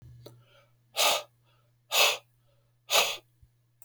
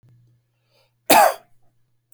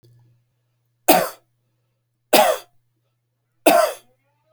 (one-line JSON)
{"exhalation_length": "3.8 s", "exhalation_amplitude": 13763, "exhalation_signal_mean_std_ratio": 0.36, "cough_length": "2.1 s", "cough_amplitude": 32768, "cough_signal_mean_std_ratio": 0.27, "three_cough_length": "4.5 s", "three_cough_amplitude": 32768, "three_cough_signal_mean_std_ratio": 0.3, "survey_phase": "beta (2021-08-13 to 2022-03-07)", "age": "45-64", "gender": "Male", "wearing_mask": "No", "symptom_none": true, "smoker_status": "Never smoked", "respiratory_condition_asthma": false, "respiratory_condition_other": false, "recruitment_source": "REACT", "submission_delay": "2 days", "covid_test_result": "Negative", "covid_test_method": "RT-qPCR"}